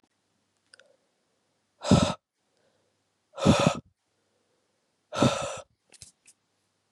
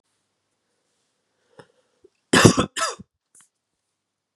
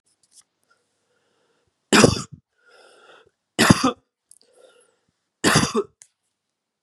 {
  "exhalation_length": "6.9 s",
  "exhalation_amplitude": 16155,
  "exhalation_signal_mean_std_ratio": 0.27,
  "cough_length": "4.4 s",
  "cough_amplitude": 32768,
  "cough_signal_mean_std_ratio": 0.22,
  "three_cough_length": "6.8 s",
  "three_cough_amplitude": 32768,
  "three_cough_signal_mean_std_ratio": 0.27,
  "survey_phase": "beta (2021-08-13 to 2022-03-07)",
  "age": "18-44",
  "gender": "Male",
  "wearing_mask": "No",
  "symptom_cough_any": true,
  "symptom_runny_or_blocked_nose": true,
  "symptom_fatigue": true,
  "symptom_headache": true,
  "smoker_status": "Never smoked",
  "respiratory_condition_asthma": false,
  "respiratory_condition_other": false,
  "recruitment_source": "Test and Trace",
  "submission_delay": "2 days",
  "covid_test_result": "Positive",
  "covid_test_method": "RT-qPCR",
  "covid_ct_value": 15.4,
  "covid_ct_gene": "ORF1ab gene",
  "covid_ct_mean": 15.6,
  "covid_viral_load": "7500000 copies/ml",
  "covid_viral_load_category": "High viral load (>1M copies/ml)"
}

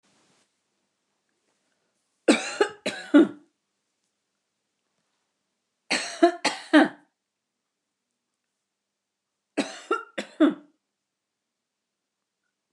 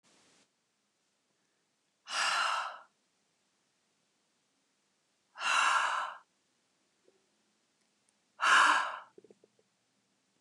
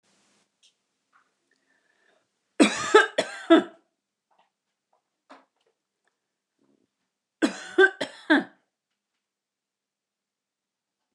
{
  "three_cough_length": "12.7 s",
  "three_cough_amplitude": 20582,
  "three_cough_signal_mean_std_ratio": 0.24,
  "exhalation_length": "10.4 s",
  "exhalation_amplitude": 7691,
  "exhalation_signal_mean_std_ratio": 0.33,
  "cough_length": "11.1 s",
  "cough_amplitude": 23280,
  "cough_signal_mean_std_ratio": 0.22,
  "survey_phase": "beta (2021-08-13 to 2022-03-07)",
  "age": "45-64",
  "gender": "Female",
  "wearing_mask": "No",
  "symptom_runny_or_blocked_nose": true,
  "smoker_status": "Never smoked",
  "respiratory_condition_asthma": false,
  "respiratory_condition_other": false,
  "recruitment_source": "REACT",
  "submission_delay": "1 day",
  "covid_test_result": "Negative",
  "covid_test_method": "RT-qPCR"
}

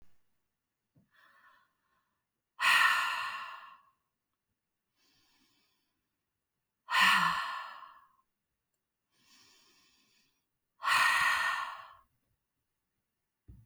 {
  "exhalation_length": "13.7 s",
  "exhalation_amplitude": 7078,
  "exhalation_signal_mean_std_ratio": 0.34,
  "survey_phase": "alpha (2021-03-01 to 2021-08-12)",
  "age": "45-64",
  "gender": "Female",
  "wearing_mask": "No",
  "symptom_none": true,
  "smoker_status": "Never smoked",
  "respiratory_condition_asthma": false,
  "respiratory_condition_other": false,
  "recruitment_source": "REACT",
  "submission_delay": "1 day",
  "covid_test_result": "Negative",
  "covid_test_method": "RT-qPCR"
}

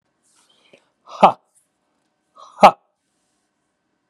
{
  "exhalation_length": "4.1 s",
  "exhalation_amplitude": 32768,
  "exhalation_signal_mean_std_ratio": 0.17,
  "survey_phase": "beta (2021-08-13 to 2022-03-07)",
  "age": "45-64",
  "gender": "Male",
  "wearing_mask": "No",
  "symptom_none": true,
  "smoker_status": "Ex-smoker",
  "respiratory_condition_asthma": false,
  "respiratory_condition_other": false,
  "recruitment_source": "REACT",
  "submission_delay": "1 day",
  "covid_test_result": "Negative",
  "covid_test_method": "RT-qPCR",
  "influenza_a_test_result": "Unknown/Void",
  "influenza_b_test_result": "Unknown/Void"
}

